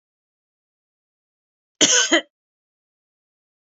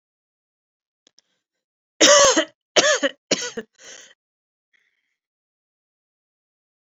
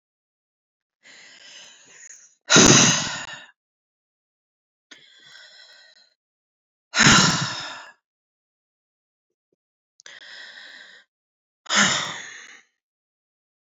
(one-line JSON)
{"cough_length": "3.8 s", "cough_amplitude": 28568, "cough_signal_mean_std_ratio": 0.24, "three_cough_length": "7.0 s", "three_cough_amplitude": 30048, "three_cough_signal_mean_std_ratio": 0.27, "exhalation_length": "13.7 s", "exhalation_amplitude": 30188, "exhalation_signal_mean_std_ratio": 0.28, "survey_phase": "beta (2021-08-13 to 2022-03-07)", "age": "18-44", "gender": "Female", "wearing_mask": "No", "symptom_none": true, "smoker_status": "Never smoked", "respiratory_condition_asthma": true, "respiratory_condition_other": false, "recruitment_source": "REACT", "submission_delay": "2 days", "covid_test_result": "Negative", "covid_test_method": "RT-qPCR"}